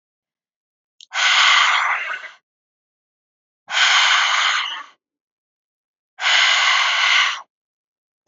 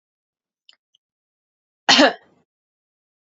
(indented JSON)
{
  "exhalation_length": "8.3 s",
  "exhalation_amplitude": 26784,
  "exhalation_signal_mean_std_ratio": 0.54,
  "cough_length": "3.2 s",
  "cough_amplitude": 31273,
  "cough_signal_mean_std_ratio": 0.21,
  "survey_phase": "beta (2021-08-13 to 2022-03-07)",
  "age": "18-44",
  "gender": "Female",
  "wearing_mask": "No",
  "symptom_none": true,
  "symptom_onset": "12 days",
  "smoker_status": "Never smoked",
  "respiratory_condition_asthma": false,
  "respiratory_condition_other": false,
  "recruitment_source": "REACT",
  "submission_delay": "3 days",
  "covid_test_result": "Negative",
  "covid_test_method": "RT-qPCR"
}